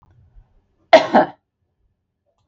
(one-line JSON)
{"cough_length": "2.5 s", "cough_amplitude": 32768, "cough_signal_mean_std_ratio": 0.24, "survey_phase": "beta (2021-08-13 to 2022-03-07)", "age": "45-64", "gender": "Female", "wearing_mask": "No", "symptom_none": true, "smoker_status": "Never smoked", "respiratory_condition_asthma": false, "respiratory_condition_other": false, "recruitment_source": "REACT", "submission_delay": "2 days", "covid_test_result": "Negative", "covid_test_method": "RT-qPCR", "influenza_a_test_result": "Negative", "influenza_b_test_result": "Negative"}